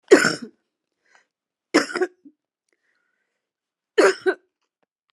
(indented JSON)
{
  "three_cough_length": "5.1 s",
  "three_cough_amplitude": 29573,
  "three_cough_signal_mean_std_ratio": 0.26,
  "survey_phase": "alpha (2021-03-01 to 2021-08-12)",
  "age": "65+",
  "gender": "Female",
  "wearing_mask": "No",
  "symptom_none": true,
  "smoker_status": "Ex-smoker",
  "respiratory_condition_asthma": false,
  "respiratory_condition_other": false,
  "recruitment_source": "REACT",
  "submission_delay": "1 day",
  "covid_test_result": "Negative",
  "covid_test_method": "RT-qPCR"
}